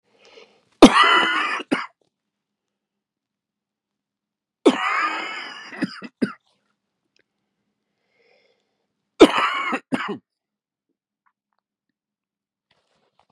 three_cough_length: 13.3 s
three_cough_amplitude: 32768
three_cough_signal_mean_std_ratio: 0.26
survey_phase: beta (2021-08-13 to 2022-03-07)
age: 45-64
gender: Male
wearing_mask: 'No'
symptom_cough_any: true
symptom_runny_or_blocked_nose: true
symptom_change_to_sense_of_smell_or_taste: true
symptom_onset: 6 days
smoker_status: Ex-smoker
respiratory_condition_asthma: false
respiratory_condition_other: false
recruitment_source: Test and Trace
submission_delay: 1 day
covid_test_result: Positive
covid_test_method: RT-qPCR
covid_ct_value: 21.1
covid_ct_gene: ORF1ab gene
covid_ct_mean: 22.0
covid_viral_load: 59000 copies/ml
covid_viral_load_category: Low viral load (10K-1M copies/ml)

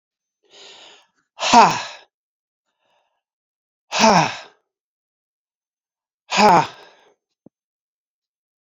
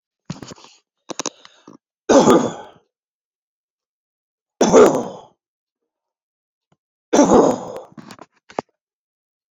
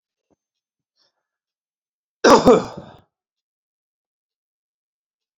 exhalation_length: 8.6 s
exhalation_amplitude: 32542
exhalation_signal_mean_std_ratio: 0.27
three_cough_length: 9.6 s
three_cough_amplitude: 30951
three_cough_signal_mean_std_ratio: 0.3
cough_length: 5.4 s
cough_amplitude: 29016
cough_signal_mean_std_ratio: 0.2
survey_phase: beta (2021-08-13 to 2022-03-07)
age: 45-64
gender: Male
wearing_mask: 'No'
symptom_none: true
smoker_status: Never smoked
respiratory_condition_asthma: false
respiratory_condition_other: false
recruitment_source: REACT
submission_delay: 1 day
covid_test_result: Negative
covid_test_method: RT-qPCR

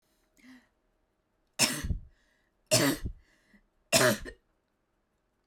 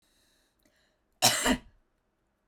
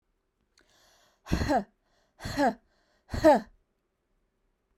three_cough_length: 5.5 s
three_cough_amplitude: 11522
three_cough_signal_mean_std_ratio: 0.33
cough_length: 2.5 s
cough_amplitude: 15519
cough_signal_mean_std_ratio: 0.29
exhalation_length: 4.8 s
exhalation_amplitude: 11407
exhalation_signal_mean_std_ratio: 0.31
survey_phase: beta (2021-08-13 to 2022-03-07)
age: 18-44
gender: Female
wearing_mask: 'No'
symptom_none: true
smoker_status: Never smoked
respiratory_condition_asthma: false
respiratory_condition_other: false
recruitment_source: REACT
submission_delay: 2 days
covid_test_result: Negative
covid_test_method: RT-qPCR
influenza_a_test_result: Negative
influenza_b_test_result: Negative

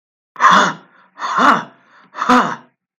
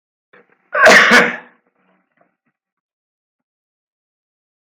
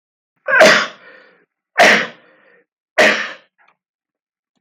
exhalation_length: 3.0 s
exhalation_amplitude: 32768
exhalation_signal_mean_std_ratio: 0.48
cough_length: 4.8 s
cough_amplitude: 32768
cough_signal_mean_std_ratio: 0.28
three_cough_length: 4.6 s
three_cough_amplitude: 32768
three_cough_signal_mean_std_ratio: 0.37
survey_phase: beta (2021-08-13 to 2022-03-07)
age: 65+
gender: Male
wearing_mask: 'No'
symptom_none: true
smoker_status: Never smoked
respiratory_condition_asthma: false
respiratory_condition_other: false
recruitment_source: REACT
submission_delay: 2 days
covid_test_result: Negative
covid_test_method: RT-qPCR
influenza_a_test_result: Negative
influenza_b_test_result: Negative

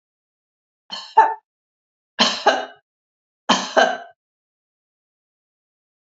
three_cough_length: 6.1 s
three_cough_amplitude: 31880
three_cough_signal_mean_std_ratio: 0.29
survey_phase: beta (2021-08-13 to 2022-03-07)
age: 65+
gender: Female
wearing_mask: 'No'
symptom_none: true
smoker_status: Ex-smoker
respiratory_condition_asthma: false
respiratory_condition_other: false
recruitment_source: REACT
submission_delay: 3 days
covid_test_result: Negative
covid_test_method: RT-qPCR
influenza_a_test_result: Negative
influenza_b_test_result: Negative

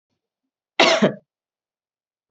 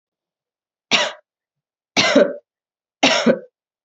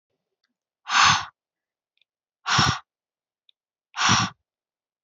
cough_length: 2.3 s
cough_amplitude: 28396
cough_signal_mean_std_ratio: 0.28
three_cough_length: 3.8 s
three_cough_amplitude: 32767
three_cough_signal_mean_std_ratio: 0.37
exhalation_length: 5.0 s
exhalation_amplitude: 21685
exhalation_signal_mean_std_ratio: 0.34
survey_phase: beta (2021-08-13 to 2022-03-07)
age: 18-44
gender: Female
wearing_mask: 'No'
symptom_cough_any: true
symptom_runny_or_blocked_nose: true
symptom_shortness_of_breath: true
symptom_sore_throat: true
symptom_fatigue: true
symptom_headache: true
symptom_change_to_sense_of_smell_or_taste: true
symptom_other: true
symptom_onset: 4 days
smoker_status: Never smoked
respiratory_condition_asthma: true
respiratory_condition_other: false
recruitment_source: Test and Trace
submission_delay: 2 days
covid_test_result: Positive
covid_test_method: RT-qPCR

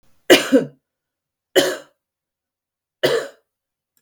three_cough_length: 4.0 s
three_cough_amplitude: 32768
three_cough_signal_mean_std_ratio: 0.3
survey_phase: beta (2021-08-13 to 2022-03-07)
age: 45-64
gender: Female
wearing_mask: 'No'
symptom_cough_any: true
symptom_fatigue: true
symptom_onset: 12 days
smoker_status: Current smoker (e-cigarettes or vapes only)
respiratory_condition_asthma: false
respiratory_condition_other: false
recruitment_source: REACT
submission_delay: 3 days
covid_test_result: Negative
covid_test_method: RT-qPCR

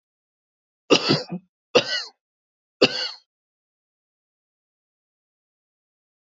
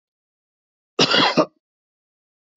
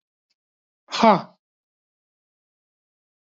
three_cough_length: 6.2 s
three_cough_amplitude: 26052
three_cough_signal_mean_std_ratio: 0.24
cough_length: 2.6 s
cough_amplitude: 22744
cough_signal_mean_std_ratio: 0.32
exhalation_length: 3.3 s
exhalation_amplitude: 27199
exhalation_signal_mean_std_ratio: 0.19
survey_phase: beta (2021-08-13 to 2022-03-07)
age: 45-64
gender: Male
wearing_mask: 'No'
symptom_none: true
smoker_status: Never smoked
respiratory_condition_asthma: true
respiratory_condition_other: false
recruitment_source: Test and Trace
submission_delay: 1 day
covid_test_result: Negative
covid_test_method: ePCR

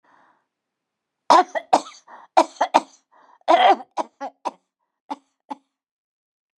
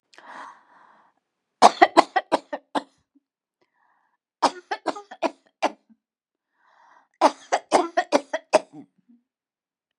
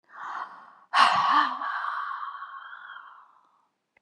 cough_length: 6.6 s
cough_amplitude: 31215
cough_signal_mean_std_ratio: 0.28
three_cough_length: 10.0 s
three_cough_amplitude: 32768
three_cough_signal_mean_std_ratio: 0.24
exhalation_length: 4.0 s
exhalation_amplitude: 17532
exhalation_signal_mean_std_ratio: 0.5
survey_phase: beta (2021-08-13 to 2022-03-07)
age: 65+
gender: Female
wearing_mask: 'No'
symptom_none: true
smoker_status: Never smoked
respiratory_condition_asthma: false
respiratory_condition_other: false
recruitment_source: REACT
submission_delay: 3 days
covid_test_result: Negative
covid_test_method: RT-qPCR
influenza_a_test_result: Negative
influenza_b_test_result: Negative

